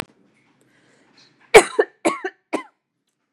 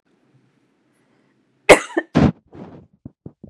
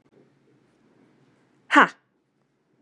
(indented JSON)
{
  "three_cough_length": "3.3 s",
  "three_cough_amplitude": 32768,
  "three_cough_signal_mean_std_ratio": 0.21,
  "cough_length": "3.5 s",
  "cough_amplitude": 32768,
  "cough_signal_mean_std_ratio": 0.23,
  "exhalation_length": "2.8 s",
  "exhalation_amplitude": 30853,
  "exhalation_signal_mean_std_ratio": 0.17,
  "survey_phase": "beta (2021-08-13 to 2022-03-07)",
  "age": "18-44",
  "gender": "Female",
  "wearing_mask": "No",
  "symptom_none": true,
  "smoker_status": "Never smoked",
  "respiratory_condition_asthma": false,
  "respiratory_condition_other": false,
  "recruitment_source": "REACT",
  "submission_delay": "1 day",
  "covid_test_result": "Negative",
  "covid_test_method": "RT-qPCR",
  "influenza_a_test_result": "Negative",
  "influenza_b_test_result": "Negative"
}